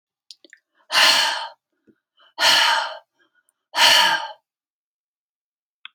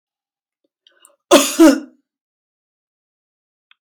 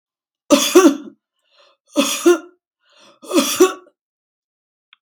{"exhalation_length": "5.9 s", "exhalation_amplitude": 30788, "exhalation_signal_mean_std_ratio": 0.41, "cough_length": "3.8 s", "cough_amplitude": 32767, "cough_signal_mean_std_ratio": 0.25, "three_cough_length": "5.0 s", "three_cough_amplitude": 32768, "three_cough_signal_mean_std_ratio": 0.36, "survey_phase": "beta (2021-08-13 to 2022-03-07)", "age": "65+", "gender": "Female", "wearing_mask": "No", "symptom_none": true, "smoker_status": "Ex-smoker", "respiratory_condition_asthma": false, "respiratory_condition_other": false, "recruitment_source": "REACT", "submission_delay": "0 days", "covid_test_result": "Negative", "covid_test_method": "RT-qPCR"}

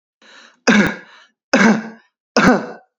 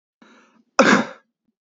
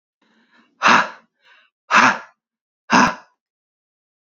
{"three_cough_length": "3.0 s", "three_cough_amplitude": 30349, "three_cough_signal_mean_std_ratio": 0.45, "cough_length": "1.7 s", "cough_amplitude": 27709, "cough_signal_mean_std_ratio": 0.31, "exhalation_length": "4.3 s", "exhalation_amplitude": 32768, "exhalation_signal_mean_std_ratio": 0.32, "survey_phase": "beta (2021-08-13 to 2022-03-07)", "age": "18-44", "gender": "Male", "wearing_mask": "No", "symptom_none": true, "smoker_status": "Never smoked", "respiratory_condition_asthma": false, "respiratory_condition_other": false, "recruitment_source": "REACT", "submission_delay": "2 days", "covid_test_result": "Negative", "covid_test_method": "RT-qPCR", "influenza_a_test_result": "Negative", "influenza_b_test_result": "Negative"}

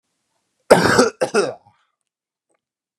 {"cough_length": "3.0 s", "cough_amplitude": 32768, "cough_signal_mean_std_ratio": 0.34, "survey_phase": "beta (2021-08-13 to 2022-03-07)", "age": "18-44", "gender": "Male", "wearing_mask": "No", "symptom_none": true, "smoker_status": "Never smoked", "respiratory_condition_asthma": false, "respiratory_condition_other": false, "recruitment_source": "REACT", "submission_delay": "1 day", "covid_test_result": "Negative", "covid_test_method": "RT-qPCR", "influenza_a_test_result": "Negative", "influenza_b_test_result": "Negative"}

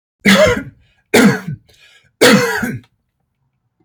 {"three_cough_length": "3.8 s", "three_cough_amplitude": 32240, "three_cough_signal_mean_std_ratio": 0.46, "survey_phase": "beta (2021-08-13 to 2022-03-07)", "age": "45-64", "gender": "Male", "wearing_mask": "No", "symptom_none": true, "smoker_status": "Ex-smoker", "respiratory_condition_asthma": false, "respiratory_condition_other": false, "recruitment_source": "REACT", "submission_delay": "0 days", "covid_test_result": "Negative", "covid_test_method": "RT-qPCR", "influenza_a_test_result": "Negative", "influenza_b_test_result": "Negative"}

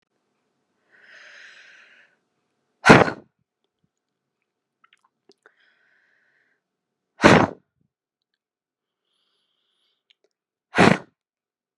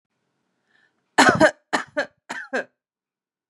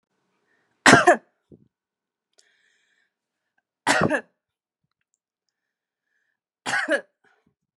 {"exhalation_length": "11.8 s", "exhalation_amplitude": 32768, "exhalation_signal_mean_std_ratio": 0.18, "three_cough_length": "3.5 s", "three_cough_amplitude": 32671, "three_cough_signal_mean_std_ratio": 0.3, "cough_length": "7.8 s", "cough_amplitude": 32701, "cough_signal_mean_std_ratio": 0.23, "survey_phase": "beta (2021-08-13 to 2022-03-07)", "age": "18-44", "gender": "Female", "wearing_mask": "No", "symptom_none": true, "smoker_status": "Ex-smoker", "respiratory_condition_asthma": false, "respiratory_condition_other": false, "recruitment_source": "Test and Trace", "submission_delay": "2 days", "covid_test_result": "Positive", "covid_test_method": "LFT"}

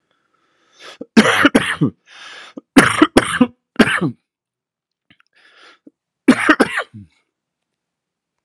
{"three_cough_length": "8.4 s", "three_cough_amplitude": 32768, "three_cough_signal_mean_std_ratio": 0.34, "survey_phase": "alpha (2021-03-01 to 2021-08-12)", "age": "18-44", "gender": "Male", "wearing_mask": "No", "symptom_cough_any": true, "symptom_fever_high_temperature": true, "symptom_headache": true, "symptom_onset": "4 days", "smoker_status": "Ex-smoker", "respiratory_condition_asthma": false, "respiratory_condition_other": false, "recruitment_source": "Test and Trace", "submission_delay": "2 days", "covid_test_result": "Positive", "covid_test_method": "RT-qPCR", "covid_ct_value": 15.2, "covid_ct_gene": "N gene", "covid_ct_mean": 15.3, "covid_viral_load": "9700000 copies/ml", "covid_viral_load_category": "High viral load (>1M copies/ml)"}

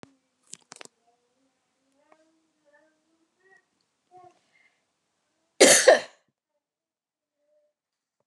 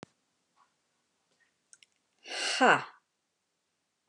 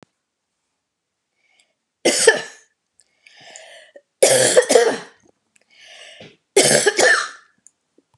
{"cough_length": "8.3 s", "cough_amplitude": 25871, "cough_signal_mean_std_ratio": 0.17, "exhalation_length": "4.1 s", "exhalation_amplitude": 12511, "exhalation_signal_mean_std_ratio": 0.23, "three_cough_length": "8.2 s", "three_cough_amplitude": 32666, "three_cough_signal_mean_std_ratio": 0.37, "survey_phase": "beta (2021-08-13 to 2022-03-07)", "age": "45-64", "gender": "Female", "wearing_mask": "No", "symptom_none": true, "smoker_status": "Never smoked", "respiratory_condition_asthma": false, "respiratory_condition_other": false, "recruitment_source": "REACT", "submission_delay": "7 days", "covid_test_result": "Negative", "covid_test_method": "RT-qPCR"}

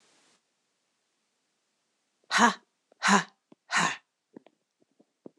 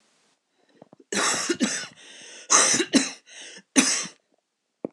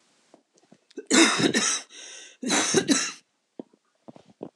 {"exhalation_length": "5.4 s", "exhalation_amplitude": 15902, "exhalation_signal_mean_std_ratio": 0.26, "three_cough_length": "4.9 s", "three_cough_amplitude": 25243, "three_cough_signal_mean_std_ratio": 0.43, "cough_length": "4.6 s", "cough_amplitude": 23108, "cough_signal_mean_std_ratio": 0.44, "survey_phase": "beta (2021-08-13 to 2022-03-07)", "age": "45-64", "gender": "Female", "wearing_mask": "No", "symptom_none": true, "smoker_status": "Never smoked", "respiratory_condition_asthma": false, "respiratory_condition_other": false, "recruitment_source": "REACT", "submission_delay": "2 days", "covid_test_result": "Negative", "covid_test_method": "RT-qPCR", "influenza_a_test_result": "Negative", "influenza_b_test_result": "Negative"}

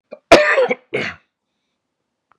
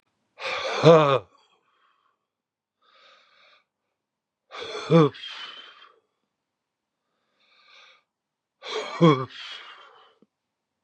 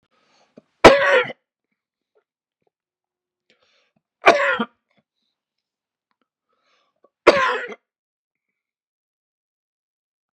{"cough_length": "2.4 s", "cough_amplitude": 32768, "cough_signal_mean_std_ratio": 0.35, "exhalation_length": "10.8 s", "exhalation_amplitude": 24143, "exhalation_signal_mean_std_ratio": 0.27, "three_cough_length": "10.3 s", "three_cough_amplitude": 32768, "three_cough_signal_mean_std_ratio": 0.22, "survey_phase": "beta (2021-08-13 to 2022-03-07)", "age": "45-64", "gender": "Male", "wearing_mask": "No", "symptom_runny_or_blocked_nose": true, "symptom_fatigue": true, "symptom_headache": true, "symptom_other": true, "symptom_onset": "3 days", "smoker_status": "Ex-smoker", "respiratory_condition_asthma": false, "respiratory_condition_other": true, "recruitment_source": "Test and Trace", "submission_delay": "1 day", "covid_test_result": "Positive", "covid_test_method": "RT-qPCR", "covid_ct_value": 20.8, "covid_ct_gene": "ORF1ab gene", "covid_ct_mean": 21.0, "covid_viral_load": "130000 copies/ml", "covid_viral_load_category": "Low viral load (10K-1M copies/ml)"}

